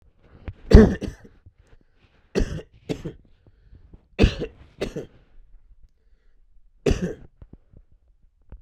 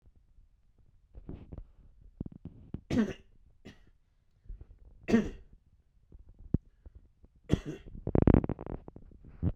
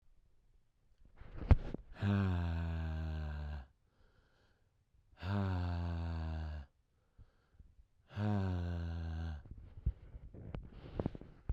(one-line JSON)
{"cough_length": "8.6 s", "cough_amplitude": 32768, "cough_signal_mean_std_ratio": 0.24, "three_cough_length": "9.6 s", "three_cough_amplitude": 14457, "three_cough_signal_mean_std_ratio": 0.28, "exhalation_length": "11.5 s", "exhalation_amplitude": 7352, "exhalation_signal_mean_std_ratio": 0.59, "survey_phase": "beta (2021-08-13 to 2022-03-07)", "age": "45-64", "gender": "Male", "wearing_mask": "No", "symptom_cough_any": true, "symptom_sore_throat": true, "symptom_fatigue": true, "symptom_fever_high_temperature": true, "symptom_headache": true, "smoker_status": "Never smoked", "respiratory_condition_asthma": false, "respiratory_condition_other": false, "recruitment_source": "Test and Trace", "submission_delay": "2 days", "covid_test_result": "Positive", "covid_test_method": "ePCR"}